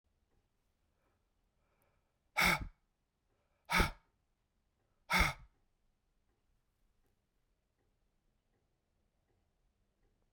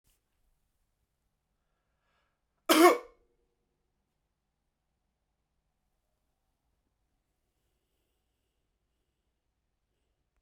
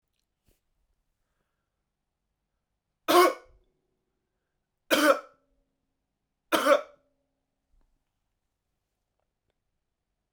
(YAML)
exhalation_length: 10.3 s
exhalation_amplitude: 5597
exhalation_signal_mean_std_ratio: 0.21
cough_length: 10.4 s
cough_amplitude: 14414
cough_signal_mean_std_ratio: 0.13
three_cough_length: 10.3 s
three_cough_amplitude: 14269
three_cough_signal_mean_std_ratio: 0.21
survey_phase: beta (2021-08-13 to 2022-03-07)
age: 18-44
gender: Male
wearing_mask: 'No'
symptom_runny_or_blocked_nose: true
smoker_status: Current smoker (1 to 10 cigarettes per day)
respiratory_condition_asthma: false
respiratory_condition_other: false
recruitment_source: REACT
submission_delay: 5 days
covid_test_result: Negative
covid_test_method: RT-qPCR